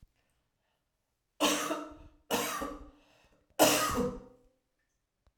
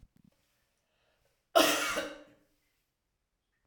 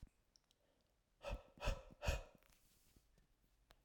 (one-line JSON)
{"three_cough_length": "5.4 s", "three_cough_amplitude": 10950, "three_cough_signal_mean_std_ratio": 0.4, "cough_length": "3.7 s", "cough_amplitude": 11433, "cough_signal_mean_std_ratio": 0.27, "exhalation_length": "3.8 s", "exhalation_amplitude": 1309, "exhalation_signal_mean_std_ratio": 0.32, "survey_phase": "alpha (2021-03-01 to 2021-08-12)", "age": "45-64", "gender": "Female", "wearing_mask": "No", "symptom_cough_any": true, "symptom_headache": true, "symptom_change_to_sense_of_smell_or_taste": true, "symptom_loss_of_taste": true, "symptom_onset": "4 days", "smoker_status": "Never smoked", "respiratory_condition_asthma": false, "respiratory_condition_other": false, "recruitment_source": "Test and Trace", "submission_delay": "2 days", "covid_test_result": "Positive", "covid_test_method": "RT-qPCR", "covid_ct_value": 16.3, "covid_ct_gene": "ORF1ab gene", "covid_ct_mean": 16.4, "covid_viral_load": "4100000 copies/ml", "covid_viral_load_category": "High viral load (>1M copies/ml)"}